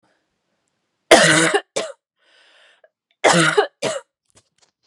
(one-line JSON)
{"cough_length": "4.9 s", "cough_amplitude": 32768, "cough_signal_mean_std_ratio": 0.36, "survey_phase": "beta (2021-08-13 to 2022-03-07)", "age": "18-44", "gender": "Female", "wearing_mask": "No", "symptom_cough_any": true, "symptom_new_continuous_cough": true, "symptom_runny_or_blocked_nose": true, "symptom_shortness_of_breath": true, "symptom_sore_throat": true, "symptom_abdominal_pain": true, "symptom_diarrhoea": true, "symptom_fatigue": true, "symptom_fever_high_temperature": true, "symptom_headache": true, "symptom_change_to_sense_of_smell_or_taste": true, "symptom_loss_of_taste": true, "symptom_onset": "2 days", "smoker_status": "Never smoked", "respiratory_condition_asthma": false, "respiratory_condition_other": false, "recruitment_source": "Test and Trace", "submission_delay": "2 days", "covid_test_result": "Positive", "covid_test_method": "RT-qPCR", "covid_ct_value": 18.5, "covid_ct_gene": "ORF1ab gene", "covid_ct_mean": 19.1, "covid_viral_load": "560000 copies/ml", "covid_viral_load_category": "Low viral load (10K-1M copies/ml)"}